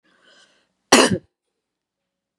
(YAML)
cough_length: 2.4 s
cough_amplitude: 32768
cough_signal_mean_std_ratio: 0.23
survey_phase: beta (2021-08-13 to 2022-03-07)
age: 18-44
gender: Female
wearing_mask: 'No'
symptom_none: true
smoker_status: Prefer not to say
respiratory_condition_asthma: false
respiratory_condition_other: false
recruitment_source: REACT
submission_delay: 0 days
covid_test_result: Negative
covid_test_method: RT-qPCR
influenza_a_test_result: Negative
influenza_b_test_result: Negative